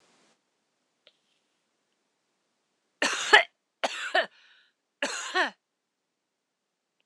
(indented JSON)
{
  "cough_length": "7.1 s",
  "cough_amplitude": 26027,
  "cough_signal_mean_std_ratio": 0.24,
  "survey_phase": "alpha (2021-03-01 to 2021-08-12)",
  "age": "45-64",
  "gender": "Female",
  "wearing_mask": "No",
  "symptom_none": true,
  "smoker_status": "Never smoked",
  "respiratory_condition_asthma": false,
  "respiratory_condition_other": false,
  "recruitment_source": "REACT",
  "submission_delay": "3 days",
  "covid_test_result": "Negative",
  "covid_test_method": "RT-qPCR"
}